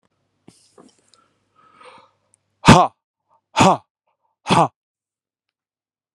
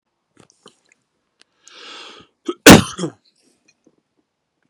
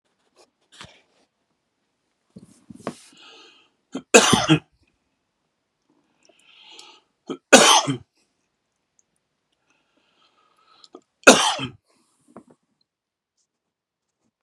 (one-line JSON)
{"exhalation_length": "6.1 s", "exhalation_amplitude": 32768, "exhalation_signal_mean_std_ratio": 0.23, "cough_length": "4.7 s", "cough_amplitude": 32768, "cough_signal_mean_std_ratio": 0.18, "three_cough_length": "14.4 s", "three_cough_amplitude": 32768, "three_cough_signal_mean_std_ratio": 0.21, "survey_phase": "beta (2021-08-13 to 2022-03-07)", "age": "45-64", "gender": "Male", "wearing_mask": "No", "symptom_shortness_of_breath": true, "symptom_fatigue": true, "smoker_status": "Never smoked", "respiratory_condition_asthma": false, "respiratory_condition_other": false, "recruitment_source": "Test and Trace", "submission_delay": "1 day", "covid_test_result": "Positive", "covid_test_method": "RT-qPCR", "covid_ct_value": 28.7, "covid_ct_gene": "ORF1ab gene", "covid_ct_mean": 29.3, "covid_viral_load": "250 copies/ml", "covid_viral_load_category": "Minimal viral load (< 10K copies/ml)"}